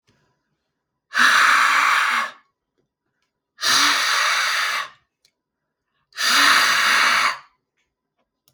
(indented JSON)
{
  "exhalation_length": "8.5 s",
  "exhalation_amplitude": 26577,
  "exhalation_signal_mean_std_ratio": 0.57,
  "survey_phase": "beta (2021-08-13 to 2022-03-07)",
  "age": "18-44",
  "gender": "Male",
  "wearing_mask": "No",
  "symptom_none": true,
  "smoker_status": "Never smoked",
  "respiratory_condition_asthma": false,
  "respiratory_condition_other": false,
  "recruitment_source": "REACT",
  "submission_delay": "1 day",
  "covid_test_result": "Negative",
  "covid_test_method": "RT-qPCR",
  "influenza_a_test_result": "Negative",
  "influenza_b_test_result": "Negative"
}